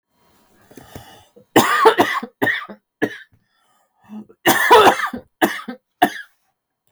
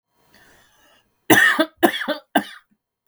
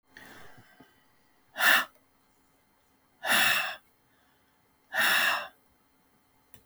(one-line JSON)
{"cough_length": "6.9 s", "cough_amplitude": 32768, "cough_signal_mean_std_ratio": 0.39, "three_cough_length": "3.1 s", "three_cough_amplitude": 32768, "three_cough_signal_mean_std_ratio": 0.36, "exhalation_length": "6.7 s", "exhalation_amplitude": 11783, "exhalation_signal_mean_std_ratio": 0.36, "survey_phase": "beta (2021-08-13 to 2022-03-07)", "age": "45-64", "gender": "Female", "wearing_mask": "No", "symptom_cough_any": true, "symptom_runny_or_blocked_nose": true, "symptom_fatigue": true, "symptom_onset": "12 days", "smoker_status": "Never smoked", "respiratory_condition_asthma": false, "respiratory_condition_other": false, "recruitment_source": "REACT", "submission_delay": "2 days", "covid_test_result": "Negative", "covid_test_method": "RT-qPCR", "influenza_a_test_result": "Unknown/Void", "influenza_b_test_result": "Unknown/Void"}